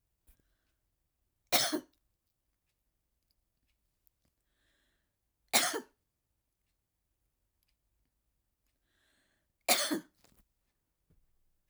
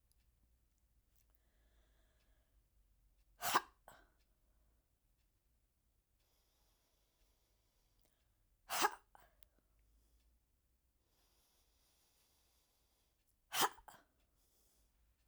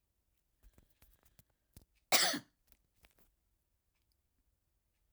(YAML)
three_cough_length: 11.7 s
three_cough_amplitude: 9975
three_cough_signal_mean_std_ratio: 0.2
exhalation_length: 15.3 s
exhalation_amplitude: 3836
exhalation_signal_mean_std_ratio: 0.18
cough_length: 5.1 s
cough_amplitude: 8402
cough_signal_mean_std_ratio: 0.18
survey_phase: alpha (2021-03-01 to 2021-08-12)
age: 65+
gender: Female
wearing_mask: 'No'
symptom_none: true
smoker_status: Never smoked
respiratory_condition_asthma: false
respiratory_condition_other: false
recruitment_source: REACT
submission_delay: 3 days
covid_test_result: Negative
covid_test_method: RT-qPCR